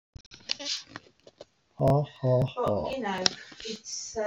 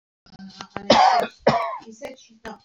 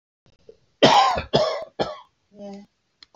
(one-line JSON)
{"exhalation_length": "4.3 s", "exhalation_amplitude": 24522, "exhalation_signal_mean_std_ratio": 0.55, "cough_length": "2.6 s", "cough_amplitude": 26569, "cough_signal_mean_std_ratio": 0.44, "three_cough_length": "3.2 s", "three_cough_amplitude": 27105, "three_cough_signal_mean_std_ratio": 0.4, "survey_phase": "beta (2021-08-13 to 2022-03-07)", "age": "65+", "gender": "Male", "wearing_mask": "Yes", "symptom_cough_any": true, "symptom_fatigue": true, "symptom_headache": true, "symptom_onset": "13 days", "smoker_status": "Never smoked", "respiratory_condition_asthma": false, "respiratory_condition_other": false, "recruitment_source": "REACT", "submission_delay": "2 days", "covid_test_result": "Negative", "covid_test_method": "RT-qPCR", "influenza_a_test_result": "Negative", "influenza_b_test_result": "Negative"}